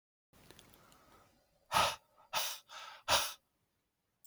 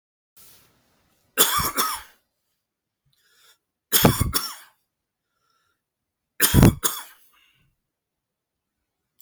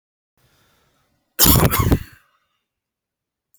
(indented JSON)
{
  "exhalation_length": "4.3 s",
  "exhalation_amplitude": 5506,
  "exhalation_signal_mean_std_ratio": 0.33,
  "three_cough_length": "9.2 s",
  "three_cough_amplitude": 32767,
  "three_cough_signal_mean_std_ratio": 0.28,
  "cough_length": "3.6 s",
  "cough_amplitude": 32768,
  "cough_signal_mean_std_ratio": 0.31,
  "survey_phase": "beta (2021-08-13 to 2022-03-07)",
  "age": "45-64",
  "gender": "Male",
  "wearing_mask": "No",
  "symptom_none": true,
  "smoker_status": "Never smoked",
  "respiratory_condition_asthma": false,
  "respiratory_condition_other": false,
  "recruitment_source": "REACT",
  "submission_delay": "1 day",
  "covid_test_result": "Negative",
  "covid_test_method": "RT-qPCR"
}